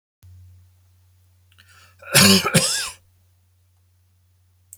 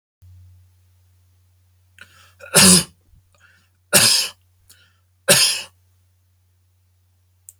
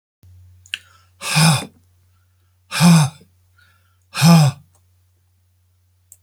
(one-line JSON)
{"cough_length": "4.8 s", "cough_amplitude": 32767, "cough_signal_mean_std_ratio": 0.3, "three_cough_length": "7.6 s", "three_cough_amplitude": 32768, "three_cough_signal_mean_std_ratio": 0.28, "exhalation_length": "6.2 s", "exhalation_amplitude": 28274, "exhalation_signal_mean_std_ratio": 0.35, "survey_phase": "beta (2021-08-13 to 2022-03-07)", "age": "65+", "gender": "Male", "wearing_mask": "No", "symptom_none": true, "smoker_status": "Ex-smoker", "respiratory_condition_asthma": false, "respiratory_condition_other": false, "recruitment_source": "REACT", "submission_delay": "2 days", "covid_test_result": "Negative", "covid_test_method": "RT-qPCR"}